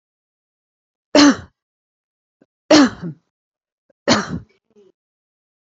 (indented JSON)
{
  "three_cough_length": "5.7 s",
  "three_cough_amplitude": 30242,
  "three_cough_signal_mean_std_ratio": 0.27,
  "survey_phase": "beta (2021-08-13 to 2022-03-07)",
  "age": "45-64",
  "gender": "Female",
  "wearing_mask": "No",
  "symptom_none": true,
  "smoker_status": "Never smoked",
  "respiratory_condition_asthma": true,
  "respiratory_condition_other": false,
  "recruitment_source": "REACT",
  "submission_delay": "9 days",
  "covid_test_result": "Negative",
  "covid_test_method": "RT-qPCR",
  "influenza_a_test_result": "Negative",
  "influenza_b_test_result": "Negative"
}